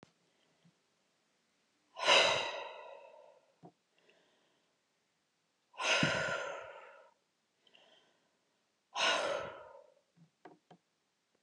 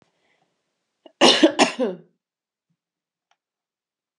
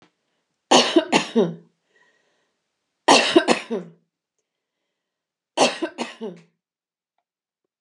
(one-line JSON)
{"exhalation_length": "11.4 s", "exhalation_amplitude": 6556, "exhalation_signal_mean_std_ratio": 0.33, "cough_length": "4.2 s", "cough_amplitude": 29094, "cough_signal_mean_std_ratio": 0.26, "three_cough_length": "7.8 s", "three_cough_amplitude": 32621, "three_cough_signal_mean_std_ratio": 0.31, "survey_phase": "alpha (2021-03-01 to 2021-08-12)", "age": "45-64", "gender": "Female", "wearing_mask": "No", "symptom_none": true, "smoker_status": "Ex-smoker", "respiratory_condition_asthma": false, "respiratory_condition_other": false, "recruitment_source": "REACT", "submission_delay": "7 days", "covid_test_result": "Negative", "covid_test_method": "RT-qPCR"}